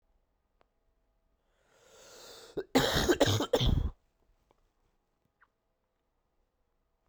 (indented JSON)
{
  "cough_length": "7.1 s",
  "cough_amplitude": 10566,
  "cough_signal_mean_std_ratio": 0.32,
  "survey_phase": "beta (2021-08-13 to 2022-03-07)",
  "age": "18-44",
  "gender": "Male",
  "wearing_mask": "No",
  "symptom_cough_any": true,
  "symptom_runny_or_blocked_nose": true,
  "symptom_sore_throat": true,
  "symptom_fatigue": true,
  "symptom_change_to_sense_of_smell_or_taste": true,
  "symptom_loss_of_taste": true,
  "symptom_other": true,
  "smoker_status": "Ex-smoker",
  "respiratory_condition_asthma": false,
  "respiratory_condition_other": false,
  "recruitment_source": "Test and Trace",
  "submission_delay": "2 days",
  "covid_test_result": "Positive",
  "covid_test_method": "LAMP"
}